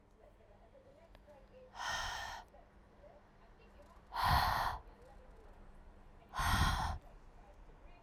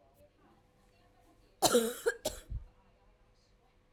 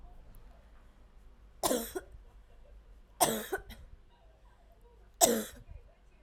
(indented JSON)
{
  "exhalation_length": "8.0 s",
  "exhalation_amplitude": 3482,
  "exhalation_signal_mean_std_ratio": 0.47,
  "cough_length": "3.9 s",
  "cough_amplitude": 8606,
  "cough_signal_mean_std_ratio": 0.3,
  "three_cough_length": "6.2 s",
  "three_cough_amplitude": 16156,
  "three_cough_signal_mean_std_ratio": 0.35,
  "survey_phase": "alpha (2021-03-01 to 2021-08-12)",
  "age": "18-44",
  "gender": "Female",
  "wearing_mask": "No",
  "symptom_cough_any": true,
  "symptom_diarrhoea": true,
  "symptom_fatigue": true,
  "symptom_headache": true,
  "symptom_change_to_sense_of_smell_or_taste": true,
  "symptom_loss_of_taste": true,
  "symptom_onset": "4 days",
  "smoker_status": "Never smoked",
  "respiratory_condition_asthma": false,
  "respiratory_condition_other": false,
  "recruitment_source": "Test and Trace",
  "submission_delay": "1 day",
  "covid_test_result": "Positive",
  "covid_test_method": "RT-qPCR",
  "covid_ct_value": 18.1,
  "covid_ct_gene": "ORF1ab gene",
  "covid_ct_mean": 18.9,
  "covid_viral_load": "650000 copies/ml",
  "covid_viral_load_category": "Low viral load (10K-1M copies/ml)"
}